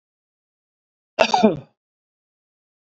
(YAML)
cough_length: 3.0 s
cough_amplitude: 32768
cough_signal_mean_std_ratio: 0.24
survey_phase: beta (2021-08-13 to 2022-03-07)
age: 65+
gender: Male
wearing_mask: 'No'
symptom_none: true
smoker_status: Ex-smoker
respiratory_condition_asthma: false
respiratory_condition_other: false
recruitment_source: REACT
submission_delay: 1 day
covid_test_result: Negative
covid_test_method: RT-qPCR
influenza_a_test_result: Negative
influenza_b_test_result: Negative